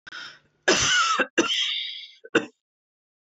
{"cough_length": "3.3 s", "cough_amplitude": 16807, "cough_signal_mean_std_ratio": 0.52, "survey_phase": "beta (2021-08-13 to 2022-03-07)", "age": "45-64", "gender": "Female", "wearing_mask": "No", "symptom_cough_any": true, "symptom_runny_or_blocked_nose": true, "symptom_shortness_of_breath": true, "symptom_fatigue": true, "symptom_headache": true, "smoker_status": "Never smoked", "respiratory_condition_asthma": false, "respiratory_condition_other": false, "recruitment_source": "Test and Trace", "submission_delay": "3 days", "covid_test_result": "Negative", "covid_test_method": "RT-qPCR"}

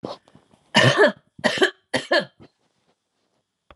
{"three_cough_length": "3.8 s", "three_cough_amplitude": 32368, "three_cough_signal_mean_std_ratio": 0.36, "survey_phase": "alpha (2021-03-01 to 2021-08-12)", "age": "65+", "gender": "Female", "wearing_mask": "No", "symptom_none": true, "smoker_status": "Never smoked", "respiratory_condition_asthma": false, "respiratory_condition_other": false, "recruitment_source": "REACT", "submission_delay": "1 day", "covid_test_result": "Negative", "covid_test_method": "RT-qPCR"}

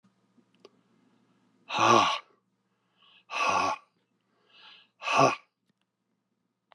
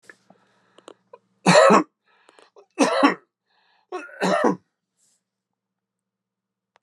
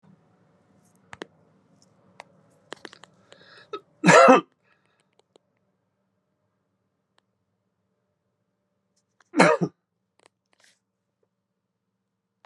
{"exhalation_length": "6.7 s", "exhalation_amplitude": 17405, "exhalation_signal_mean_std_ratio": 0.33, "three_cough_length": "6.8 s", "three_cough_amplitude": 30354, "three_cough_signal_mean_std_ratio": 0.31, "cough_length": "12.5 s", "cough_amplitude": 28477, "cough_signal_mean_std_ratio": 0.18, "survey_phase": "alpha (2021-03-01 to 2021-08-12)", "age": "65+", "gender": "Male", "wearing_mask": "No", "symptom_none": true, "smoker_status": "Ex-smoker", "respiratory_condition_asthma": false, "respiratory_condition_other": false, "recruitment_source": "REACT", "submission_delay": "1 day", "covid_test_result": "Negative", "covid_test_method": "RT-qPCR"}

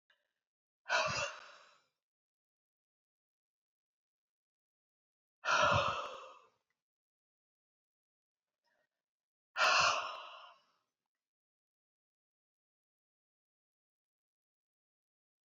{"exhalation_length": "15.4 s", "exhalation_amplitude": 4216, "exhalation_signal_mean_std_ratio": 0.26, "survey_phase": "beta (2021-08-13 to 2022-03-07)", "age": "45-64", "gender": "Female", "wearing_mask": "No", "symptom_cough_any": true, "symptom_runny_or_blocked_nose": true, "symptom_fatigue": true, "symptom_headache": true, "smoker_status": "Ex-smoker", "respiratory_condition_asthma": false, "respiratory_condition_other": false, "recruitment_source": "Test and Trace", "submission_delay": "1 day", "covid_test_result": "Positive", "covid_test_method": "RT-qPCR"}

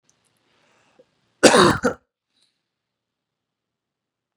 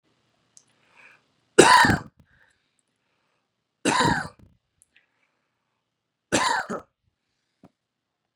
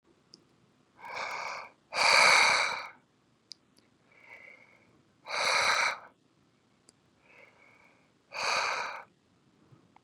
{"cough_length": "4.4 s", "cough_amplitude": 32768, "cough_signal_mean_std_ratio": 0.22, "three_cough_length": "8.4 s", "three_cough_amplitude": 32767, "three_cough_signal_mean_std_ratio": 0.26, "exhalation_length": "10.0 s", "exhalation_amplitude": 11698, "exhalation_signal_mean_std_ratio": 0.38, "survey_phase": "beta (2021-08-13 to 2022-03-07)", "age": "18-44", "gender": "Male", "wearing_mask": "No", "symptom_none": true, "smoker_status": "Never smoked", "respiratory_condition_asthma": false, "respiratory_condition_other": false, "recruitment_source": "REACT", "submission_delay": "0 days", "covid_test_result": "Negative", "covid_test_method": "RT-qPCR", "influenza_a_test_result": "Negative", "influenza_b_test_result": "Negative"}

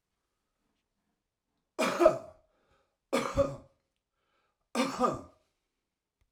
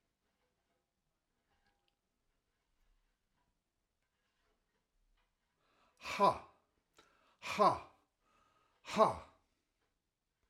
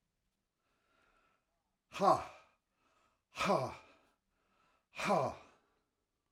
{"three_cough_length": "6.3 s", "three_cough_amplitude": 13233, "three_cough_signal_mean_std_ratio": 0.31, "cough_length": "10.5 s", "cough_amplitude": 6788, "cough_signal_mean_std_ratio": 0.2, "exhalation_length": "6.3 s", "exhalation_amplitude": 4955, "exhalation_signal_mean_std_ratio": 0.3, "survey_phase": "alpha (2021-03-01 to 2021-08-12)", "age": "65+", "gender": "Male", "wearing_mask": "No", "symptom_none": true, "smoker_status": "Current smoker (1 to 10 cigarettes per day)", "respiratory_condition_asthma": false, "respiratory_condition_other": false, "recruitment_source": "REACT", "submission_delay": "1 day", "covid_test_result": "Negative", "covid_test_method": "RT-qPCR"}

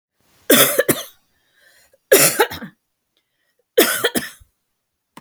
{"three_cough_length": "5.2 s", "three_cough_amplitude": 32768, "three_cough_signal_mean_std_ratio": 0.35, "survey_phase": "beta (2021-08-13 to 2022-03-07)", "age": "45-64", "gender": "Female", "wearing_mask": "No", "symptom_none": true, "smoker_status": "Never smoked", "respiratory_condition_asthma": false, "respiratory_condition_other": false, "recruitment_source": "REACT", "submission_delay": "1 day", "covid_test_result": "Negative", "covid_test_method": "RT-qPCR"}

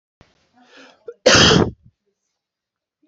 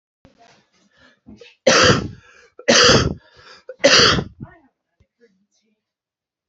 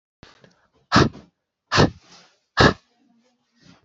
{"cough_length": "3.1 s", "cough_amplitude": 31065, "cough_signal_mean_std_ratio": 0.31, "three_cough_length": "6.5 s", "three_cough_amplitude": 32768, "three_cough_signal_mean_std_ratio": 0.36, "exhalation_length": "3.8 s", "exhalation_amplitude": 27931, "exhalation_signal_mean_std_ratio": 0.28, "survey_phase": "beta (2021-08-13 to 2022-03-07)", "age": "18-44", "gender": "Male", "wearing_mask": "No", "symptom_cough_any": true, "symptom_runny_or_blocked_nose": true, "symptom_sore_throat": true, "symptom_onset": "2 days", "smoker_status": "Ex-smoker", "respiratory_condition_asthma": false, "respiratory_condition_other": false, "recruitment_source": "Test and Trace", "submission_delay": "1 day", "covid_test_result": "Positive", "covid_test_method": "RT-qPCR", "covid_ct_value": 17.8, "covid_ct_gene": "ORF1ab gene", "covid_ct_mean": 18.2, "covid_viral_load": "1100000 copies/ml", "covid_viral_load_category": "High viral load (>1M copies/ml)"}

